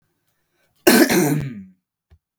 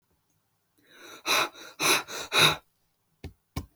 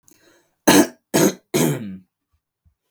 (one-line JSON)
{"cough_length": "2.4 s", "cough_amplitude": 32768, "cough_signal_mean_std_ratio": 0.4, "exhalation_length": "3.8 s", "exhalation_amplitude": 17820, "exhalation_signal_mean_std_ratio": 0.38, "three_cough_length": "2.9 s", "three_cough_amplitude": 32768, "three_cough_signal_mean_std_ratio": 0.38, "survey_phase": "beta (2021-08-13 to 2022-03-07)", "age": "18-44", "gender": "Male", "wearing_mask": "No", "symptom_none": true, "smoker_status": "Never smoked", "respiratory_condition_asthma": false, "respiratory_condition_other": false, "recruitment_source": "REACT", "submission_delay": "1 day", "covid_test_result": "Negative", "covid_test_method": "RT-qPCR"}